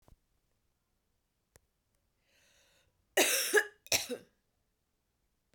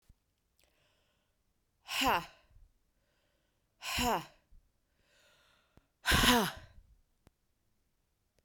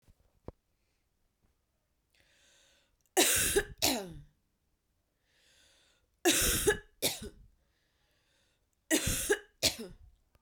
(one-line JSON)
{"cough_length": "5.5 s", "cough_amplitude": 7330, "cough_signal_mean_std_ratio": 0.26, "exhalation_length": "8.4 s", "exhalation_amplitude": 11210, "exhalation_signal_mean_std_ratio": 0.29, "three_cough_length": "10.4 s", "three_cough_amplitude": 13723, "three_cough_signal_mean_std_ratio": 0.35, "survey_phase": "beta (2021-08-13 to 2022-03-07)", "age": "45-64", "gender": "Female", "wearing_mask": "No", "symptom_cough_any": true, "symptom_new_continuous_cough": true, "symptom_runny_or_blocked_nose": true, "symptom_fatigue": true, "symptom_headache": true, "symptom_other": true, "symptom_onset": "4 days", "smoker_status": "Ex-smoker", "respiratory_condition_asthma": true, "respiratory_condition_other": false, "recruitment_source": "Test and Trace", "submission_delay": "1 day", "covid_test_result": "Positive", "covid_test_method": "RT-qPCR", "covid_ct_value": 17.6, "covid_ct_gene": "ORF1ab gene", "covid_ct_mean": 17.8, "covid_viral_load": "1500000 copies/ml", "covid_viral_load_category": "High viral load (>1M copies/ml)"}